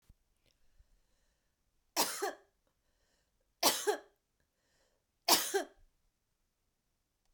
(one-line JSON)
{"three_cough_length": "7.3 s", "three_cough_amplitude": 8888, "three_cough_signal_mean_std_ratio": 0.26, "survey_phase": "beta (2021-08-13 to 2022-03-07)", "age": "45-64", "gender": "Female", "wearing_mask": "No", "symptom_change_to_sense_of_smell_or_taste": true, "smoker_status": "Current smoker (e-cigarettes or vapes only)", "respiratory_condition_asthma": false, "respiratory_condition_other": false, "recruitment_source": "REACT", "submission_delay": "1 day", "covid_test_result": "Negative", "covid_test_method": "RT-qPCR"}